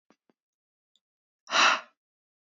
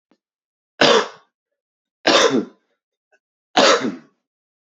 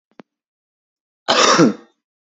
{"exhalation_length": "2.6 s", "exhalation_amplitude": 12994, "exhalation_signal_mean_std_ratio": 0.25, "three_cough_length": "4.6 s", "three_cough_amplitude": 32767, "three_cough_signal_mean_std_ratio": 0.36, "cough_length": "2.3 s", "cough_amplitude": 32767, "cough_signal_mean_std_ratio": 0.36, "survey_phase": "beta (2021-08-13 to 2022-03-07)", "age": "18-44", "gender": "Male", "wearing_mask": "No", "symptom_runny_or_blocked_nose": true, "symptom_shortness_of_breath": true, "symptom_sore_throat": true, "symptom_fatigue": true, "symptom_fever_high_temperature": true, "symptom_headache": true, "symptom_change_to_sense_of_smell_or_taste": true, "symptom_loss_of_taste": true, "symptom_onset": "3 days", "smoker_status": "Ex-smoker", "respiratory_condition_asthma": false, "respiratory_condition_other": false, "recruitment_source": "Test and Trace", "submission_delay": "1 day", "covid_test_result": "Positive", "covid_test_method": "RT-qPCR", "covid_ct_value": 32.2, "covid_ct_gene": "ORF1ab gene"}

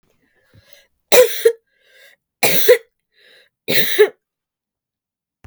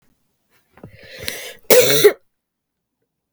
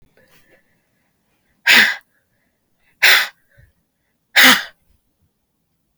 {"three_cough_length": "5.5 s", "three_cough_amplitude": 32768, "three_cough_signal_mean_std_ratio": 0.34, "cough_length": "3.3 s", "cough_amplitude": 32768, "cough_signal_mean_std_ratio": 0.31, "exhalation_length": "6.0 s", "exhalation_amplitude": 32768, "exhalation_signal_mean_std_ratio": 0.28, "survey_phase": "beta (2021-08-13 to 2022-03-07)", "age": "45-64", "gender": "Female", "wearing_mask": "No", "symptom_shortness_of_breath": true, "symptom_onset": "13 days", "smoker_status": "Ex-smoker", "respiratory_condition_asthma": true, "respiratory_condition_other": false, "recruitment_source": "REACT", "submission_delay": "1 day", "covid_test_result": "Negative", "covid_test_method": "RT-qPCR", "influenza_a_test_result": "Negative", "influenza_b_test_result": "Negative"}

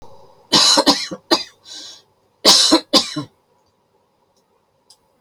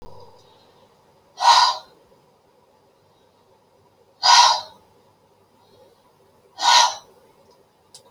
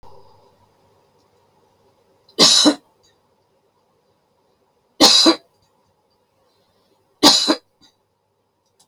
{"cough_length": "5.2 s", "cough_amplitude": 32768, "cough_signal_mean_std_ratio": 0.38, "exhalation_length": "8.1 s", "exhalation_amplitude": 29688, "exhalation_signal_mean_std_ratio": 0.3, "three_cough_length": "8.9 s", "three_cough_amplitude": 32767, "three_cough_signal_mean_std_ratio": 0.27, "survey_phase": "beta (2021-08-13 to 2022-03-07)", "age": "65+", "gender": "Female", "wearing_mask": "No", "symptom_cough_any": true, "symptom_shortness_of_breath": true, "symptom_sore_throat": true, "symptom_abdominal_pain": true, "symptom_headache": true, "symptom_change_to_sense_of_smell_or_taste": true, "smoker_status": "Never smoked", "respiratory_condition_asthma": false, "respiratory_condition_other": false, "recruitment_source": "REACT", "submission_delay": "1 day", "covid_test_result": "Negative", "covid_test_method": "RT-qPCR"}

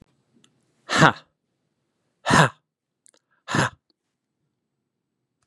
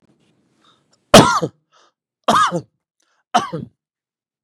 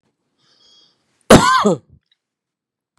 {"exhalation_length": "5.5 s", "exhalation_amplitude": 32767, "exhalation_signal_mean_std_ratio": 0.24, "three_cough_length": "4.4 s", "three_cough_amplitude": 32768, "three_cough_signal_mean_std_ratio": 0.29, "cough_length": "3.0 s", "cough_amplitude": 32768, "cough_signal_mean_std_ratio": 0.29, "survey_phase": "beta (2021-08-13 to 2022-03-07)", "age": "45-64", "gender": "Male", "wearing_mask": "No", "symptom_none": true, "smoker_status": "Never smoked", "respiratory_condition_asthma": false, "respiratory_condition_other": false, "recruitment_source": "REACT", "submission_delay": "6 days", "covid_test_result": "Negative", "covid_test_method": "RT-qPCR", "influenza_a_test_result": "Negative", "influenza_b_test_result": "Negative"}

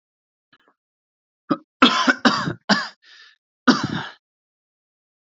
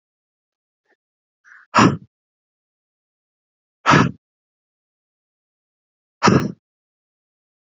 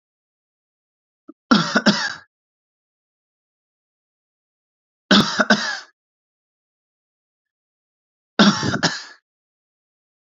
{"cough_length": "5.3 s", "cough_amplitude": 28768, "cough_signal_mean_std_ratio": 0.32, "exhalation_length": "7.7 s", "exhalation_amplitude": 28462, "exhalation_signal_mean_std_ratio": 0.23, "three_cough_length": "10.2 s", "three_cough_amplitude": 29054, "three_cough_signal_mean_std_ratio": 0.28, "survey_phase": "alpha (2021-03-01 to 2021-08-12)", "age": "18-44", "gender": "Male", "wearing_mask": "No", "symptom_none": true, "smoker_status": "Ex-smoker", "respiratory_condition_asthma": true, "respiratory_condition_other": false, "recruitment_source": "REACT", "submission_delay": "3 days", "covid_test_result": "Negative", "covid_test_method": "RT-qPCR"}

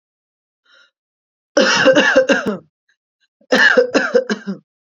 {"cough_length": "4.9 s", "cough_amplitude": 31771, "cough_signal_mean_std_ratio": 0.49, "survey_phase": "alpha (2021-03-01 to 2021-08-12)", "age": "18-44", "gender": "Female", "wearing_mask": "No", "symptom_none": true, "smoker_status": "Current smoker (1 to 10 cigarettes per day)", "respiratory_condition_asthma": false, "respiratory_condition_other": false, "recruitment_source": "REACT", "submission_delay": "5 days", "covid_test_result": "Negative", "covid_test_method": "RT-qPCR"}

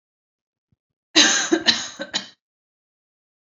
{"cough_length": "3.5 s", "cough_amplitude": 30987, "cough_signal_mean_std_ratio": 0.33, "survey_phase": "beta (2021-08-13 to 2022-03-07)", "age": "18-44", "gender": "Female", "wearing_mask": "No", "symptom_none": true, "smoker_status": "Never smoked", "respiratory_condition_asthma": false, "respiratory_condition_other": false, "recruitment_source": "Test and Trace", "submission_delay": "0 days", "covid_test_result": "Positive", "covid_test_method": "LFT"}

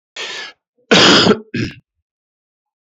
{"cough_length": "2.8 s", "cough_amplitude": 32768, "cough_signal_mean_std_ratio": 0.41, "survey_phase": "beta (2021-08-13 to 2022-03-07)", "age": "65+", "gender": "Male", "wearing_mask": "No", "symptom_none": true, "smoker_status": "Ex-smoker", "respiratory_condition_asthma": false, "respiratory_condition_other": false, "recruitment_source": "REACT", "submission_delay": "2 days", "covid_test_result": "Negative", "covid_test_method": "RT-qPCR", "influenza_a_test_result": "Unknown/Void", "influenza_b_test_result": "Unknown/Void"}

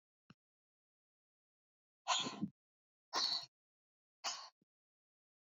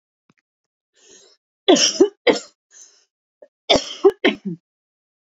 {"exhalation_length": "5.5 s", "exhalation_amplitude": 2396, "exhalation_signal_mean_std_ratio": 0.3, "cough_length": "5.2 s", "cough_amplitude": 28983, "cough_signal_mean_std_ratio": 0.31, "survey_phase": "beta (2021-08-13 to 2022-03-07)", "age": "18-44", "gender": "Female", "wearing_mask": "No", "symptom_none": true, "symptom_onset": "12 days", "smoker_status": "Current smoker (e-cigarettes or vapes only)", "respiratory_condition_asthma": false, "respiratory_condition_other": false, "recruitment_source": "REACT", "submission_delay": "0 days", "covid_test_result": "Negative", "covid_test_method": "RT-qPCR"}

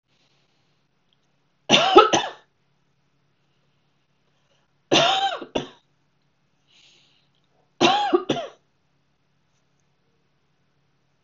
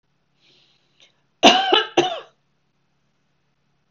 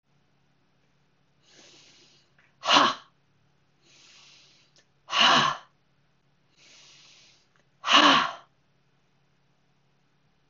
{"three_cough_length": "11.2 s", "three_cough_amplitude": 32768, "three_cough_signal_mean_std_ratio": 0.28, "cough_length": "3.9 s", "cough_amplitude": 32768, "cough_signal_mean_std_ratio": 0.28, "exhalation_length": "10.5 s", "exhalation_amplitude": 21988, "exhalation_signal_mean_std_ratio": 0.27, "survey_phase": "beta (2021-08-13 to 2022-03-07)", "age": "45-64", "gender": "Female", "wearing_mask": "No", "symptom_none": true, "smoker_status": "Ex-smoker", "respiratory_condition_asthma": false, "respiratory_condition_other": false, "recruitment_source": "REACT", "submission_delay": "2 days", "covid_test_result": "Negative", "covid_test_method": "RT-qPCR", "influenza_a_test_result": "Negative", "influenza_b_test_result": "Negative"}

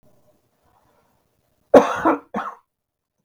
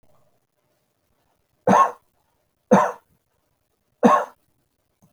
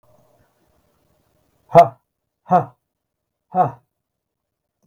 {"cough_length": "3.2 s", "cough_amplitude": 32768, "cough_signal_mean_std_ratio": 0.25, "three_cough_length": "5.1 s", "three_cough_amplitude": 29656, "three_cough_signal_mean_std_ratio": 0.28, "exhalation_length": "4.9 s", "exhalation_amplitude": 32768, "exhalation_signal_mean_std_ratio": 0.21, "survey_phase": "beta (2021-08-13 to 2022-03-07)", "age": "65+", "gender": "Male", "wearing_mask": "No", "symptom_cough_any": true, "smoker_status": "Never smoked", "respiratory_condition_asthma": false, "respiratory_condition_other": false, "recruitment_source": "REACT", "submission_delay": "3 days", "covid_test_result": "Negative", "covid_test_method": "RT-qPCR", "influenza_a_test_result": "Negative", "influenza_b_test_result": "Negative"}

